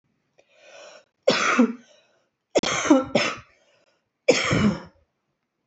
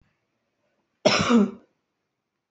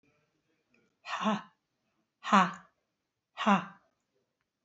{"three_cough_length": "5.7 s", "three_cough_amplitude": 20393, "three_cough_signal_mean_std_ratio": 0.41, "cough_length": "2.5 s", "cough_amplitude": 20382, "cough_signal_mean_std_ratio": 0.33, "exhalation_length": "4.6 s", "exhalation_amplitude": 13469, "exhalation_signal_mean_std_ratio": 0.28, "survey_phase": "alpha (2021-03-01 to 2021-08-12)", "age": "45-64", "gender": "Female", "wearing_mask": "No", "symptom_fatigue": true, "symptom_change_to_sense_of_smell_or_taste": true, "symptom_onset": "5 days", "smoker_status": "Never smoked", "respiratory_condition_asthma": false, "respiratory_condition_other": false, "recruitment_source": "Test and Trace", "submission_delay": "2 days", "covid_test_result": "Positive", "covid_test_method": "RT-qPCR", "covid_ct_value": 23.4, "covid_ct_gene": "ORF1ab gene"}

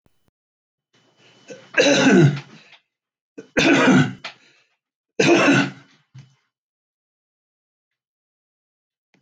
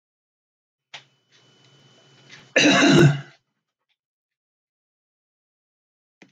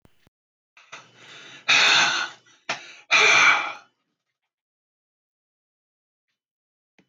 {"three_cough_length": "9.2 s", "three_cough_amplitude": 23143, "three_cough_signal_mean_std_ratio": 0.36, "cough_length": "6.3 s", "cough_amplitude": 21451, "cough_signal_mean_std_ratio": 0.27, "exhalation_length": "7.1 s", "exhalation_amplitude": 18324, "exhalation_signal_mean_std_ratio": 0.35, "survey_phase": "alpha (2021-03-01 to 2021-08-12)", "age": "65+", "gender": "Male", "wearing_mask": "No", "symptom_none": true, "smoker_status": "Ex-smoker", "respiratory_condition_asthma": false, "respiratory_condition_other": false, "recruitment_source": "REACT", "submission_delay": "2 days", "covid_test_result": "Negative", "covid_test_method": "RT-qPCR"}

